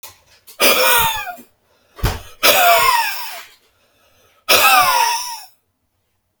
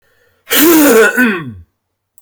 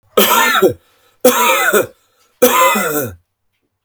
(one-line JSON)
{"exhalation_length": "6.4 s", "exhalation_amplitude": 32768, "exhalation_signal_mean_std_ratio": 0.53, "cough_length": "2.2 s", "cough_amplitude": 32768, "cough_signal_mean_std_ratio": 0.63, "three_cough_length": "3.8 s", "three_cough_amplitude": 32768, "three_cough_signal_mean_std_ratio": 0.61, "survey_phase": "beta (2021-08-13 to 2022-03-07)", "age": "45-64", "gender": "Male", "wearing_mask": "No", "symptom_none": true, "smoker_status": "Never smoked", "respiratory_condition_asthma": false, "respiratory_condition_other": false, "recruitment_source": "REACT", "submission_delay": "1 day", "covid_test_result": "Negative", "covid_test_method": "RT-qPCR", "influenza_a_test_result": "Negative", "influenza_b_test_result": "Negative"}